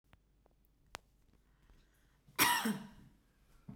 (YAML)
cough_length: 3.8 s
cough_amplitude: 5624
cough_signal_mean_std_ratio: 0.29
survey_phase: beta (2021-08-13 to 2022-03-07)
age: 18-44
gender: Female
wearing_mask: 'No'
symptom_runny_or_blocked_nose: true
symptom_sore_throat: true
symptom_headache: true
smoker_status: Never smoked
respiratory_condition_asthma: true
respiratory_condition_other: false
recruitment_source: REACT
submission_delay: 1 day
covid_test_result: Negative
covid_test_method: RT-qPCR